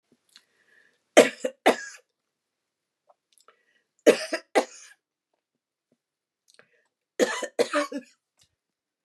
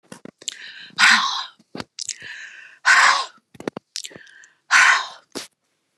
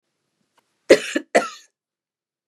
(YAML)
three_cough_length: 9.0 s
three_cough_amplitude: 28341
three_cough_signal_mean_std_ratio: 0.22
exhalation_length: 6.0 s
exhalation_amplitude: 28794
exhalation_signal_mean_std_ratio: 0.39
cough_length: 2.5 s
cough_amplitude: 32768
cough_signal_mean_std_ratio: 0.22
survey_phase: beta (2021-08-13 to 2022-03-07)
age: 45-64
gender: Female
wearing_mask: 'No'
symptom_headache: true
smoker_status: Never smoked
respiratory_condition_asthma: false
respiratory_condition_other: false
recruitment_source: REACT
submission_delay: 7 days
covid_test_result: Negative
covid_test_method: RT-qPCR
influenza_a_test_result: Negative
influenza_b_test_result: Negative